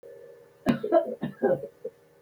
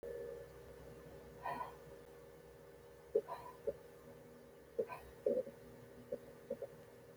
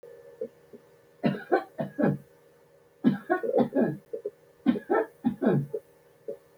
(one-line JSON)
{"cough_length": "2.2 s", "cough_amplitude": 10411, "cough_signal_mean_std_ratio": 0.46, "exhalation_length": "7.2 s", "exhalation_amplitude": 2530, "exhalation_signal_mean_std_ratio": 0.52, "three_cough_length": "6.6 s", "three_cough_amplitude": 11811, "three_cough_signal_mean_std_ratio": 0.48, "survey_phase": "beta (2021-08-13 to 2022-03-07)", "age": "65+", "gender": "Female", "wearing_mask": "No", "symptom_none": true, "smoker_status": "Never smoked", "respiratory_condition_asthma": false, "respiratory_condition_other": false, "recruitment_source": "REACT", "submission_delay": "11 days", "covid_test_result": "Negative", "covid_test_method": "RT-qPCR"}